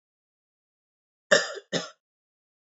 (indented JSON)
{
  "three_cough_length": "2.7 s",
  "three_cough_amplitude": 19054,
  "three_cough_signal_mean_std_ratio": 0.22,
  "survey_phase": "beta (2021-08-13 to 2022-03-07)",
  "age": "18-44",
  "gender": "Male",
  "wearing_mask": "No",
  "symptom_cough_any": true,
  "symptom_runny_or_blocked_nose": true,
  "symptom_fatigue": true,
  "symptom_headache": true,
  "smoker_status": "Never smoked",
  "respiratory_condition_asthma": false,
  "respiratory_condition_other": false,
  "recruitment_source": "Test and Trace",
  "submission_delay": "2 days",
  "covid_test_result": "Positive",
  "covid_test_method": "RT-qPCR",
  "covid_ct_value": 22.6,
  "covid_ct_gene": "N gene"
}